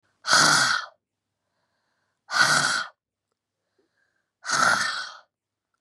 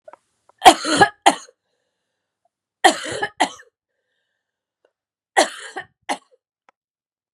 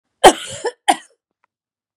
{
  "exhalation_length": "5.8 s",
  "exhalation_amplitude": 22769,
  "exhalation_signal_mean_std_ratio": 0.43,
  "three_cough_length": "7.3 s",
  "three_cough_amplitude": 32768,
  "three_cough_signal_mean_std_ratio": 0.24,
  "cough_length": "2.0 s",
  "cough_amplitude": 32768,
  "cough_signal_mean_std_ratio": 0.25,
  "survey_phase": "beta (2021-08-13 to 2022-03-07)",
  "age": "45-64",
  "gender": "Female",
  "wearing_mask": "No",
  "symptom_cough_any": true,
  "symptom_runny_or_blocked_nose": true,
  "symptom_fever_high_temperature": true,
  "symptom_headache": true,
  "symptom_onset": "2 days",
  "smoker_status": "Ex-smoker",
  "respiratory_condition_asthma": false,
  "respiratory_condition_other": false,
  "recruitment_source": "Test and Trace",
  "submission_delay": "1 day",
  "covid_test_result": "Positive",
  "covid_test_method": "RT-qPCR",
  "covid_ct_value": 21.1,
  "covid_ct_gene": "N gene"
}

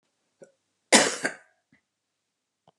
{
  "cough_length": "2.8 s",
  "cough_amplitude": 28676,
  "cough_signal_mean_std_ratio": 0.22,
  "survey_phase": "beta (2021-08-13 to 2022-03-07)",
  "age": "45-64",
  "gender": "Female",
  "wearing_mask": "No",
  "symptom_none": true,
  "smoker_status": "Current smoker (11 or more cigarettes per day)",
  "respiratory_condition_asthma": false,
  "respiratory_condition_other": false,
  "recruitment_source": "REACT",
  "submission_delay": "1 day",
  "covid_test_result": "Negative",
  "covid_test_method": "RT-qPCR"
}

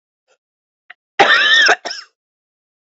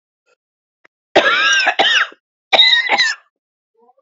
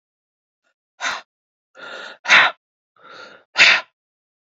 {
  "cough_length": "2.9 s",
  "cough_amplitude": 30100,
  "cough_signal_mean_std_ratio": 0.39,
  "three_cough_length": "4.0 s",
  "three_cough_amplitude": 29899,
  "three_cough_signal_mean_std_ratio": 0.51,
  "exhalation_length": "4.5 s",
  "exhalation_amplitude": 31626,
  "exhalation_signal_mean_std_ratio": 0.29,
  "survey_phase": "beta (2021-08-13 to 2022-03-07)",
  "age": "45-64",
  "gender": "Female",
  "wearing_mask": "No",
  "symptom_cough_any": true,
  "symptom_new_continuous_cough": true,
  "symptom_runny_or_blocked_nose": true,
  "symptom_shortness_of_breath": true,
  "symptom_sore_throat": true,
  "symptom_fatigue": true,
  "symptom_fever_high_temperature": true,
  "symptom_headache": true,
  "symptom_change_to_sense_of_smell_or_taste": true,
  "symptom_other": true,
  "symptom_onset": "3 days",
  "smoker_status": "Ex-smoker",
  "respiratory_condition_asthma": false,
  "respiratory_condition_other": false,
  "recruitment_source": "Test and Trace",
  "submission_delay": "1 day",
  "covid_test_result": "Positive",
  "covid_test_method": "RT-qPCR",
  "covid_ct_value": 20.6,
  "covid_ct_gene": "ORF1ab gene",
  "covid_ct_mean": 21.4,
  "covid_viral_load": "95000 copies/ml",
  "covid_viral_load_category": "Low viral load (10K-1M copies/ml)"
}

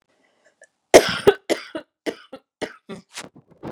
{
  "cough_length": "3.7 s",
  "cough_amplitude": 32768,
  "cough_signal_mean_std_ratio": 0.24,
  "survey_phase": "beta (2021-08-13 to 2022-03-07)",
  "age": "45-64",
  "gender": "Female",
  "wearing_mask": "No",
  "symptom_none": true,
  "smoker_status": "Never smoked",
  "respiratory_condition_asthma": false,
  "respiratory_condition_other": false,
  "recruitment_source": "REACT",
  "submission_delay": "3 days",
  "covid_test_result": "Negative",
  "covid_test_method": "RT-qPCR",
  "influenza_a_test_result": "Negative",
  "influenza_b_test_result": "Negative"
}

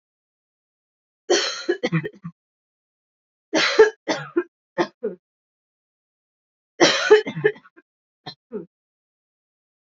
{
  "three_cough_length": "9.8 s",
  "three_cough_amplitude": 27390,
  "three_cough_signal_mean_std_ratio": 0.31,
  "survey_phase": "beta (2021-08-13 to 2022-03-07)",
  "age": "18-44",
  "gender": "Female",
  "wearing_mask": "No",
  "symptom_cough_any": true,
  "symptom_new_continuous_cough": true,
  "symptom_runny_or_blocked_nose": true,
  "symptom_shortness_of_breath": true,
  "symptom_sore_throat": true,
  "symptom_fatigue": true,
  "symptom_fever_high_temperature": true,
  "symptom_headache": true,
  "symptom_change_to_sense_of_smell_or_taste": true,
  "symptom_other": true,
  "symptom_onset": "3 days",
  "smoker_status": "Ex-smoker",
  "respiratory_condition_asthma": false,
  "respiratory_condition_other": false,
  "recruitment_source": "Test and Trace",
  "submission_delay": "2 days",
  "covid_test_result": "Positive",
  "covid_test_method": "RT-qPCR"
}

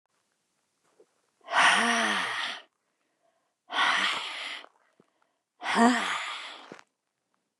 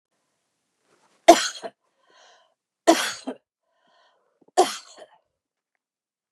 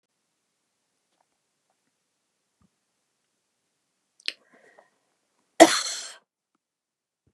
{
  "exhalation_length": "7.6 s",
  "exhalation_amplitude": 14632,
  "exhalation_signal_mean_std_ratio": 0.45,
  "three_cough_length": "6.3 s",
  "three_cough_amplitude": 32768,
  "three_cough_signal_mean_std_ratio": 0.2,
  "cough_length": "7.3 s",
  "cough_amplitude": 32768,
  "cough_signal_mean_std_ratio": 0.12,
  "survey_phase": "beta (2021-08-13 to 2022-03-07)",
  "age": "65+",
  "gender": "Female",
  "wearing_mask": "No",
  "symptom_none": true,
  "smoker_status": "Ex-smoker",
  "respiratory_condition_asthma": false,
  "respiratory_condition_other": false,
  "recruitment_source": "REACT",
  "submission_delay": "1 day",
  "covid_test_result": "Negative",
  "covid_test_method": "RT-qPCR",
  "influenza_a_test_result": "Negative",
  "influenza_b_test_result": "Negative"
}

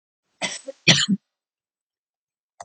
{
  "cough_length": "2.6 s",
  "cough_amplitude": 29362,
  "cough_signal_mean_std_ratio": 0.27,
  "survey_phase": "alpha (2021-03-01 to 2021-08-12)",
  "age": "45-64",
  "gender": "Female",
  "wearing_mask": "No",
  "symptom_abdominal_pain": true,
  "symptom_fatigue": true,
  "symptom_onset": "6 days",
  "smoker_status": "Never smoked",
  "respiratory_condition_asthma": false,
  "respiratory_condition_other": false,
  "recruitment_source": "REACT",
  "submission_delay": "1 day",
  "covid_test_result": "Negative",
  "covid_test_method": "RT-qPCR"
}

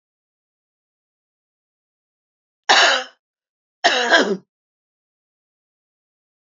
{
  "three_cough_length": "6.6 s",
  "three_cough_amplitude": 30991,
  "three_cough_signal_mean_std_ratio": 0.27,
  "survey_phase": "beta (2021-08-13 to 2022-03-07)",
  "age": "65+",
  "gender": "Female",
  "wearing_mask": "No",
  "symptom_none": true,
  "smoker_status": "Never smoked",
  "respiratory_condition_asthma": true,
  "respiratory_condition_other": false,
  "recruitment_source": "REACT",
  "submission_delay": "2 days",
  "covid_test_result": "Negative",
  "covid_test_method": "RT-qPCR",
  "influenza_a_test_result": "Negative",
  "influenza_b_test_result": "Negative"
}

